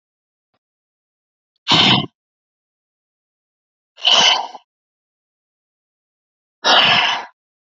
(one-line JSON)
{"exhalation_length": "7.7 s", "exhalation_amplitude": 30116, "exhalation_signal_mean_std_ratio": 0.33, "survey_phase": "beta (2021-08-13 to 2022-03-07)", "age": "18-44", "gender": "Female", "wearing_mask": "No", "symptom_cough_any": true, "symptom_runny_or_blocked_nose": true, "symptom_shortness_of_breath": true, "symptom_sore_throat": true, "symptom_fatigue": true, "symptom_fever_high_temperature": true, "symptom_headache": true, "symptom_onset": "3 days", "smoker_status": "Ex-smoker", "respiratory_condition_asthma": true, "respiratory_condition_other": false, "recruitment_source": "Test and Trace", "submission_delay": "2 days", "covid_test_result": "Positive", "covid_test_method": "RT-qPCR", "covid_ct_value": 26.0, "covid_ct_gene": "N gene"}